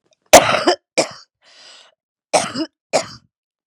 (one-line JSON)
{"cough_length": "3.7 s", "cough_amplitude": 32768, "cough_signal_mean_std_ratio": 0.32, "survey_phase": "beta (2021-08-13 to 2022-03-07)", "age": "45-64", "gender": "Female", "wearing_mask": "No", "symptom_cough_any": true, "symptom_fatigue": true, "symptom_headache": true, "symptom_onset": "2 days", "smoker_status": "Ex-smoker", "respiratory_condition_asthma": false, "respiratory_condition_other": false, "recruitment_source": "Test and Trace", "submission_delay": "2 days", "covid_test_result": "Negative", "covid_test_method": "RT-qPCR"}